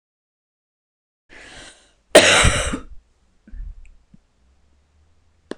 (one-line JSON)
{"cough_length": "5.6 s", "cough_amplitude": 26028, "cough_signal_mean_std_ratio": 0.27, "survey_phase": "beta (2021-08-13 to 2022-03-07)", "age": "45-64", "gender": "Female", "wearing_mask": "No", "symptom_none": true, "smoker_status": "Current smoker (1 to 10 cigarettes per day)", "respiratory_condition_asthma": false, "respiratory_condition_other": false, "recruitment_source": "REACT", "submission_delay": "3 days", "covid_test_result": "Negative", "covid_test_method": "RT-qPCR"}